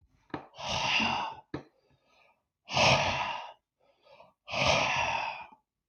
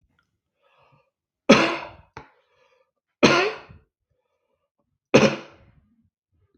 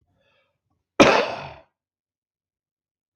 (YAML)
exhalation_length: 5.9 s
exhalation_amplitude: 8991
exhalation_signal_mean_std_ratio: 0.53
three_cough_length: 6.6 s
three_cough_amplitude: 32766
three_cough_signal_mean_std_ratio: 0.26
cough_length: 3.2 s
cough_amplitude: 32766
cough_signal_mean_std_ratio: 0.24
survey_phase: beta (2021-08-13 to 2022-03-07)
age: 65+
gender: Male
wearing_mask: 'No'
symptom_none: true
smoker_status: Never smoked
respiratory_condition_asthma: false
respiratory_condition_other: false
recruitment_source: REACT
submission_delay: 3 days
covid_test_result: Negative
covid_test_method: RT-qPCR
covid_ct_value: 38.0
covid_ct_gene: N gene